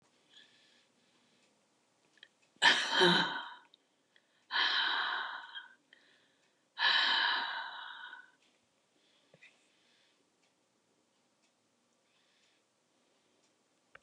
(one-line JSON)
{"exhalation_length": "14.0 s", "exhalation_amplitude": 8420, "exhalation_signal_mean_std_ratio": 0.34, "survey_phase": "beta (2021-08-13 to 2022-03-07)", "age": "65+", "gender": "Female", "wearing_mask": "No", "symptom_none": true, "smoker_status": "Never smoked", "respiratory_condition_asthma": false, "respiratory_condition_other": false, "recruitment_source": "REACT", "submission_delay": "2 days", "covid_test_result": "Negative", "covid_test_method": "RT-qPCR", "influenza_a_test_result": "Negative", "influenza_b_test_result": "Negative"}